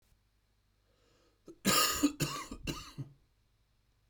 {
  "cough_length": "4.1 s",
  "cough_amplitude": 5575,
  "cough_signal_mean_std_ratio": 0.37,
  "survey_phase": "beta (2021-08-13 to 2022-03-07)",
  "age": "45-64",
  "gender": "Male",
  "wearing_mask": "No",
  "symptom_cough_any": true,
  "symptom_sore_throat": true,
  "symptom_fatigue": true,
  "symptom_headache": true,
  "symptom_onset": "4 days",
  "smoker_status": "Never smoked",
  "respiratory_condition_asthma": false,
  "respiratory_condition_other": false,
  "recruitment_source": "Test and Trace",
  "submission_delay": "2 days",
  "covid_test_result": "Positive",
  "covid_test_method": "RT-qPCR"
}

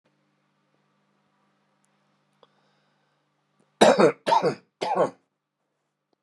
{
  "three_cough_length": "6.2 s",
  "three_cough_amplitude": 29107,
  "three_cough_signal_mean_std_ratio": 0.27,
  "survey_phase": "beta (2021-08-13 to 2022-03-07)",
  "age": "45-64",
  "gender": "Male",
  "wearing_mask": "No",
  "symptom_fatigue": true,
  "smoker_status": "Ex-smoker",
  "respiratory_condition_asthma": false,
  "respiratory_condition_other": false,
  "recruitment_source": "REACT",
  "submission_delay": "1 day",
  "covid_test_result": "Negative",
  "covid_test_method": "RT-qPCR"
}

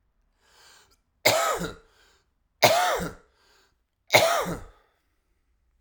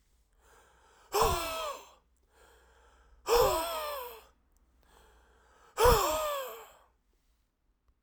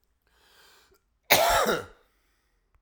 {
  "three_cough_length": "5.8 s",
  "three_cough_amplitude": 24476,
  "three_cough_signal_mean_std_ratio": 0.36,
  "exhalation_length": "8.0 s",
  "exhalation_amplitude": 9808,
  "exhalation_signal_mean_std_ratio": 0.39,
  "cough_length": "2.8 s",
  "cough_amplitude": 21713,
  "cough_signal_mean_std_ratio": 0.34,
  "survey_phase": "alpha (2021-03-01 to 2021-08-12)",
  "age": "45-64",
  "gender": "Male",
  "wearing_mask": "No",
  "symptom_cough_any": true,
  "symptom_new_continuous_cough": true,
  "symptom_fatigue": true,
  "symptom_fever_high_temperature": true,
  "symptom_headache": true,
  "symptom_change_to_sense_of_smell_or_taste": true,
  "smoker_status": "Ex-smoker",
  "respiratory_condition_asthma": false,
  "respiratory_condition_other": false,
  "recruitment_source": "Test and Trace",
  "submission_delay": "1 day",
  "covid_test_result": "Positive",
  "covid_test_method": "RT-qPCR"
}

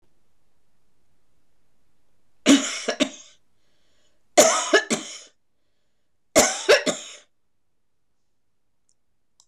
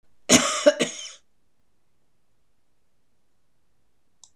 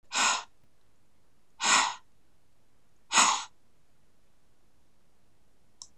{
  "three_cough_length": "9.5 s",
  "three_cough_amplitude": 24650,
  "three_cough_signal_mean_std_ratio": 0.3,
  "cough_length": "4.4 s",
  "cough_amplitude": 25458,
  "cough_signal_mean_std_ratio": 0.26,
  "exhalation_length": "6.0 s",
  "exhalation_amplitude": 14295,
  "exhalation_signal_mean_std_ratio": 0.37,
  "survey_phase": "beta (2021-08-13 to 2022-03-07)",
  "age": "65+",
  "gender": "Female",
  "wearing_mask": "No",
  "symptom_none": true,
  "smoker_status": "Never smoked",
  "respiratory_condition_asthma": false,
  "respiratory_condition_other": false,
  "recruitment_source": "REACT",
  "submission_delay": "1 day",
  "covid_test_result": "Negative",
  "covid_test_method": "RT-qPCR",
  "influenza_a_test_result": "Negative",
  "influenza_b_test_result": "Negative"
}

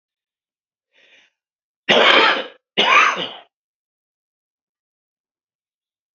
{
  "cough_length": "6.1 s",
  "cough_amplitude": 29255,
  "cough_signal_mean_std_ratio": 0.32,
  "survey_phase": "beta (2021-08-13 to 2022-03-07)",
  "age": "65+",
  "gender": "Male",
  "wearing_mask": "No",
  "symptom_cough_any": true,
  "symptom_shortness_of_breath": true,
  "symptom_onset": "11 days",
  "smoker_status": "Never smoked",
  "respiratory_condition_asthma": true,
  "respiratory_condition_other": false,
  "recruitment_source": "REACT",
  "submission_delay": "3 days",
  "covid_test_result": "Negative",
  "covid_test_method": "RT-qPCR",
  "influenza_a_test_result": "Negative",
  "influenza_b_test_result": "Negative"
}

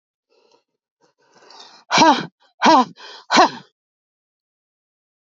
{
  "exhalation_length": "5.4 s",
  "exhalation_amplitude": 28691,
  "exhalation_signal_mean_std_ratio": 0.3,
  "survey_phase": "beta (2021-08-13 to 2022-03-07)",
  "age": "45-64",
  "gender": "Female",
  "wearing_mask": "No",
  "symptom_none": true,
  "smoker_status": "Ex-smoker",
  "respiratory_condition_asthma": false,
  "respiratory_condition_other": false,
  "recruitment_source": "REACT",
  "submission_delay": "0 days",
  "covid_test_result": "Negative",
  "covid_test_method": "RT-qPCR",
  "influenza_a_test_result": "Negative",
  "influenza_b_test_result": "Negative"
}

